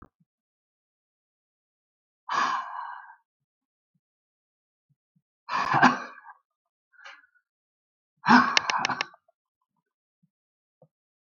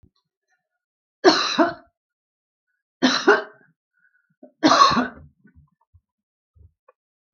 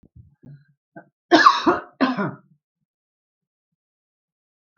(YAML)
exhalation_length: 11.3 s
exhalation_amplitude: 32766
exhalation_signal_mean_std_ratio: 0.26
three_cough_length: 7.3 s
three_cough_amplitude: 31385
three_cough_signal_mean_std_ratio: 0.31
cough_length: 4.8 s
cough_amplitude: 32768
cough_signal_mean_std_ratio: 0.28
survey_phase: beta (2021-08-13 to 2022-03-07)
age: 65+
gender: Female
wearing_mask: 'No'
symptom_runny_or_blocked_nose: true
smoker_status: Ex-smoker
respiratory_condition_asthma: false
respiratory_condition_other: false
recruitment_source: REACT
submission_delay: 2 days
covid_test_result: Negative
covid_test_method: RT-qPCR
influenza_a_test_result: Negative
influenza_b_test_result: Negative